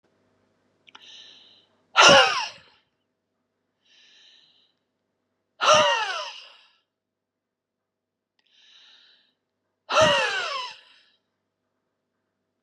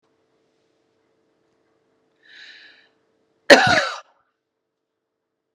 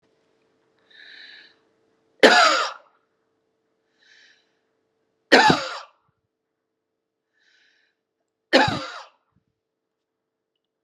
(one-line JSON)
{"exhalation_length": "12.6 s", "exhalation_amplitude": 29322, "exhalation_signal_mean_std_ratio": 0.28, "cough_length": "5.5 s", "cough_amplitude": 32768, "cough_signal_mean_std_ratio": 0.19, "three_cough_length": "10.8 s", "three_cough_amplitude": 32567, "three_cough_signal_mean_std_ratio": 0.24, "survey_phase": "beta (2021-08-13 to 2022-03-07)", "age": "45-64", "gender": "Female", "wearing_mask": "No", "symptom_none": true, "smoker_status": "Never smoked", "respiratory_condition_asthma": false, "respiratory_condition_other": false, "recruitment_source": "Test and Trace", "submission_delay": "-1 day", "covid_test_result": "Negative", "covid_test_method": "LFT"}